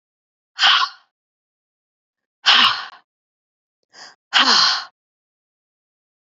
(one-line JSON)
{"exhalation_length": "6.4 s", "exhalation_amplitude": 29539, "exhalation_signal_mean_std_ratio": 0.33, "survey_phase": "beta (2021-08-13 to 2022-03-07)", "age": "45-64", "gender": "Female", "wearing_mask": "No", "symptom_runny_or_blocked_nose": true, "symptom_sore_throat": true, "symptom_onset": "2 days", "smoker_status": "Never smoked", "respiratory_condition_asthma": false, "respiratory_condition_other": false, "recruitment_source": "Test and Trace", "submission_delay": "1 day", "covid_test_result": "Positive", "covid_test_method": "RT-qPCR", "covid_ct_value": 26.8, "covid_ct_gene": "ORF1ab gene", "covid_ct_mean": 27.2, "covid_viral_load": "1200 copies/ml", "covid_viral_load_category": "Minimal viral load (< 10K copies/ml)"}